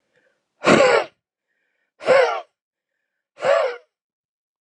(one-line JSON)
{"exhalation_length": "4.6 s", "exhalation_amplitude": 29579, "exhalation_signal_mean_std_ratio": 0.38, "survey_phase": "beta (2021-08-13 to 2022-03-07)", "age": "18-44", "gender": "Male", "wearing_mask": "No", "symptom_cough_any": true, "symptom_new_continuous_cough": true, "symptom_runny_or_blocked_nose": true, "symptom_sore_throat": true, "symptom_headache": true, "symptom_change_to_sense_of_smell_or_taste": true, "symptom_loss_of_taste": true, "symptom_other": true, "symptom_onset": "5 days", "smoker_status": "Never smoked", "respiratory_condition_asthma": false, "respiratory_condition_other": false, "recruitment_source": "Test and Trace", "submission_delay": "1 day", "covid_test_result": "Positive", "covid_test_method": "RT-qPCR", "covid_ct_value": 18.5, "covid_ct_gene": "ORF1ab gene", "covid_ct_mean": 19.5, "covid_viral_load": "410000 copies/ml", "covid_viral_load_category": "Low viral load (10K-1M copies/ml)"}